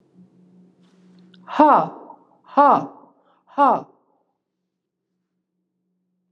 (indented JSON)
{
  "exhalation_length": "6.3 s",
  "exhalation_amplitude": 32100,
  "exhalation_signal_mean_std_ratio": 0.28,
  "survey_phase": "alpha (2021-03-01 to 2021-08-12)",
  "age": "45-64",
  "gender": "Female",
  "wearing_mask": "No",
  "symptom_none": true,
  "smoker_status": "Never smoked",
  "respiratory_condition_asthma": false,
  "respiratory_condition_other": false,
  "recruitment_source": "Test and Trace",
  "submission_delay": "0 days",
  "covid_test_result": "Negative",
  "covid_test_method": "LFT"
}